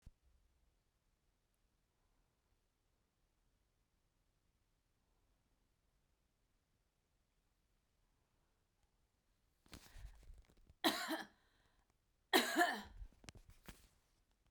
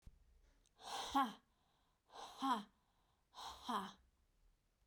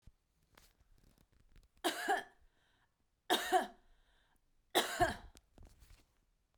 {"cough_length": "14.5 s", "cough_amplitude": 4908, "cough_signal_mean_std_ratio": 0.21, "exhalation_length": "4.9 s", "exhalation_amplitude": 1701, "exhalation_signal_mean_std_ratio": 0.37, "three_cough_length": "6.6 s", "three_cough_amplitude": 4531, "three_cough_signal_mean_std_ratio": 0.32, "survey_phase": "beta (2021-08-13 to 2022-03-07)", "age": "45-64", "gender": "Female", "wearing_mask": "No", "symptom_none": true, "smoker_status": "Never smoked", "respiratory_condition_asthma": false, "respiratory_condition_other": false, "recruitment_source": "REACT", "submission_delay": "2 days", "covid_test_result": "Negative", "covid_test_method": "RT-qPCR"}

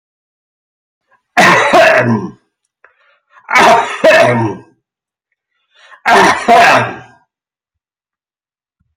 {"three_cough_length": "9.0 s", "three_cough_amplitude": 32768, "three_cough_signal_mean_std_ratio": 0.48, "survey_phase": "beta (2021-08-13 to 2022-03-07)", "age": "65+", "gender": "Male", "wearing_mask": "No", "symptom_runny_or_blocked_nose": true, "symptom_headache": true, "symptom_onset": "9 days", "smoker_status": "Never smoked", "respiratory_condition_asthma": false, "respiratory_condition_other": false, "recruitment_source": "REACT", "submission_delay": "2 days", "covid_test_result": "Negative", "covid_test_method": "RT-qPCR"}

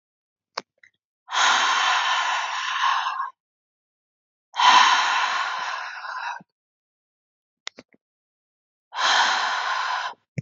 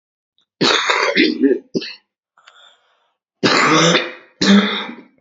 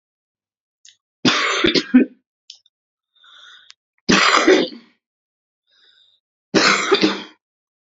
{"exhalation_length": "10.4 s", "exhalation_amplitude": 25316, "exhalation_signal_mean_std_ratio": 0.54, "cough_length": "5.2 s", "cough_amplitude": 32767, "cough_signal_mean_std_ratio": 0.54, "three_cough_length": "7.9 s", "three_cough_amplitude": 29359, "three_cough_signal_mean_std_ratio": 0.39, "survey_phase": "beta (2021-08-13 to 2022-03-07)", "age": "18-44", "gender": "Female", "wearing_mask": "No", "symptom_diarrhoea": true, "symptom_onset": "11 days", "smoker_status": "Current smoker (1 to 10 cigarettes per day)", "respiratory_condition_asthma": false, "respiratory_condition_other": false, "recruitment_source": "REACT", "submission_delay": "3 days", "covid_test_result": "Negative", "covid_test_method": "RT-qPCR", "influenza_a_test_result": "Negative", "influenza_b_test_result": "Negative"}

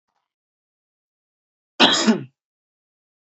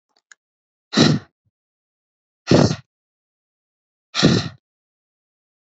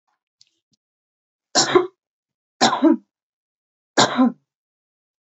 {"cough_length": "3.3 s", "cough_amplitude": 28440, "cough_signal_mean_std_ratio": 0.26, "exhalation_length": "5.7 s", "exhalation_amplitude": 28878, "exhalation_signal_mean_std_ratio": 0.28, "three_cough_length": "5.3 s", "three_cough_amplitude": 28661, "three_cough_signal_mean_std_ratio": 0.32, "survey_phase": "beta (2021-08-13 to 2022-03-07)", "age": "18-44", "gender": "Female", "wearing_mask": "No", "symptom_none": true, "smoker_status": "Ex-smoker", "respiratory_condition_asthma": false, "respiratory_condition_other": false, "recruitment_source": "REACT", "submission_delay": "1 day", "covid_test_result": "Negative", "covid_test_method": "RT-qPCR", "influenza_a_test_result": "Negative", "influenza_b_test_result": "Negative"}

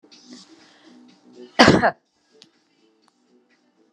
{"cough_length": "3.9 s", "cough_amplitude": 32763, "cough_signal_mean_std_ratio": 0.23, "survey_phase": "beta (2021-08-13 to 2022-03-07)", "age": "65+", "gender": "Female", "wearing_mask": "No", "symptom_other": true, "smoker_status": "Ex-smoker", "respiratory_condition_asthma": false, "respiratory_condition_other": false, "recruitment_source": "REACT", "submission_delay": "6 days", "covid_test_result": "Negative", "covid_test_method": "RT-qPCR"}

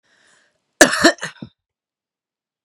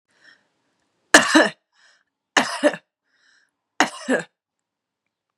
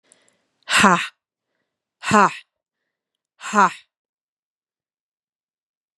{"cough_length": "2.6 s", "cough_amplitude": 32768, "cough_signal_mean_std_ratio": 0.24, "three_cough_length": "5.4 s", "three_cough_amplitude": 32768, "three_cough_signal_mean_std_ratio": 0.27, "exhalation_length": "6.0 s", "exhalation_amplitude": 32767, "exhalation_signal_mean_std_ratio": 0.26, "survey_phase": "beta (2021-08-13 to 2022-03-07)", "age": "45-64", "gender": "Female", "wearing_mask": "No", "symptom_runny_or_blocked_nose": true, "symptom_fatigue": true, "symptom_fever_high_temperature": true, "symptom_headache": true, "symptom_onset": "2 days", "smoker_status": "Ex-smoker", "respiratory_condition_asthma": false, "respiratory_condition_other": false, "recruitment_source": "Test and Trace", "submission_delay": "1 day", "covid_test_result": "Positive", "covid_test_method": "ePCR"}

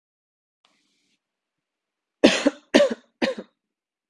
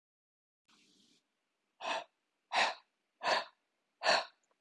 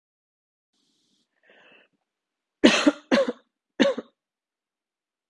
{"cough_length": "4.1 s", "cough_amplitude": 32766, "cough_signal_mean_std_ratio": 0.25, "exhalation_length": "4.6 s", "exhalation_amplitude": 5416, "exhalation_signal_mean_std_ratio": 0.33, "three_cough_length": "5.3 s", "three_cough_amplitude": 28159, "three_cough_signal_mean_std_ratio": 0.25, "survey_phase": "beta (2021-08-13 to 2022-03-07)", "age": "18-44", "gender": "Female", "wearing_mask": "No", "symptom_runny_or_blocked_nose": true, "symptom_sore_throat": true, "symptom_onset": "4 days", "smoker_status": "Current smoker (1 to 10 cigarettes per day)", "respiratory_condition_asthma": false, "respiratory_condition_other": false, "recruitment_source": "Test and Trace", "submission_delay": "1 day", "covid_test_result": "Positive", "covid_test_method": "RT-qPCR", "covid_ct_value": 24.0, "covid_ct_gene": "N gene"}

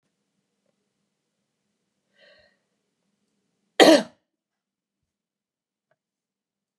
{"cough_length": "6.8 s", "cough_amplitude": 30904, "cough_signal_mean_std_ratio": 0.14, "survey_phase": "beta (2021-08-13 to 2022-03-07)", "age": "65+", "gender": "Female", "wearing_mask": "No", "symptom_cough_any": true, "smoker_status": "Ex-smoker", "respiratory_condition_asthma": false, "respiratory_condition_other": false, "recruitment_source": "REACT", "submission_delay": "1 day", "covid_test_result": "Negative", "covid_test_method": "RT-qPCR", "influenza_a_test_result": "Negative", "influenza_b_test_result": "Negative"}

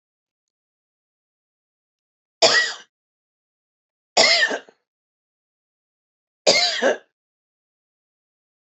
{"three_cough_length": "8.6 s", "three_cough_amplitude": 28582, "three_cough_signal_mean_std_ratio": 0.28, "survey_phase": "beta (2021-08-13 to 2022-03-07)", "age": "45-64", "gender": "Female", "wearing_mask": "No", "symptom_none": true, "smoker_status": "Never smoked", "respiratory_condition_asthma": false, "respiratory_condition_other": false, "recruitment_source": "REACT", "submission_delay": "2 days", "covid_test_result": "Negative", "covid_test_method": "RT-qPCR"}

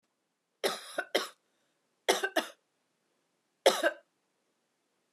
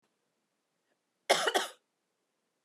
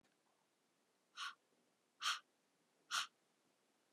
{"three_cough_length": "5.1 s", "three_cough_amplitude": 11813, "three_cough_signal_mean_std_ratio": 0.28, "cough_length": "2.6 s", "cough_amplitude": 9557, "cough_signal_mean_std_ratio": 0.26, "exhalation_length": "3.9 s", "exhalation_amplitude": 1475, "exhalation_signal_mean_std_ratio": 0.27, "survey_phase": "beta (2021-08-13 to 2022-03-07)", "age": "45-64", "gender": "Male", "wearing_mask": "No", "symptom_cough_any": true, "symptom_runny_or_blocked_nose": true, "symptom_sore_throat": true, "symptom_fatigue": true, "symptom_fever_high_temperature": true, "symptom_headache": true, "symptom_onset": "3 days", "smoker_status": "Never smoked", "respiratory_condition_asthma": false, "respiratory_condition_other": false, "recruitment_source": "Test and Trace", "submission_delay": "1 day", "covid_test_result": "Positive", "covid_test_method": "RT-qPCR", "covid_ct_value": 27.4, "covid_ct_gene": "N gene"}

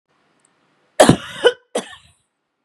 {"cough_length": "2.6 s", "cough_amplitude": 32768, "cough_signal_mean_std_ratio": 0.26, "survey_phase": "beta (2021-08-13 to 2022-03-07)", "age": "45-64", "gender": "Female", "wearing_mask": "No", "symptom_loss_of_taste": true, "smoker_status": "Ex-smoker", "respiratory_condition_asthma": false, "respiratory_condition_other": false, "recruitment_source": "Test and Trace", "submission_delay": "2 days", "covid_test_result": "Positive", "covid_test_method": "RT-qPCR", "covid_ct_value": 32.4, "covid_ct_gene": "N gene"}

